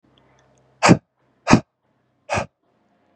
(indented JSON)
{
  "exhalation_length": "3.2 s",
  "exhalation_amplitude": 32768,
  "exhalation_signal_mean_std_ratio": 0.24,
  "survey_phase": "beta (2021-08-13 to 2022-03-07)",
  "age": "18-44",
  "gender": "Male",
  "wearing_mask": "No",
  "symptom_cough_any": true,
  "symptom_sore_throat": true,
  "symptom_fatigue": true,
  "symptom_fever_high_temperature": true,
  "symptom_headache": true,
  "symptom_onset": "3 days",
  "smoker_status": "Never smoked",
  "respiratory_condition_asthma": false,
  "respiratory_condition_other": false,
  "recruitment_source": "Test and Trace",
  "submission_delay": "1 day",
  "covid_test_result": "Positive",
  "covid_test_method": "RT-qPCR"
}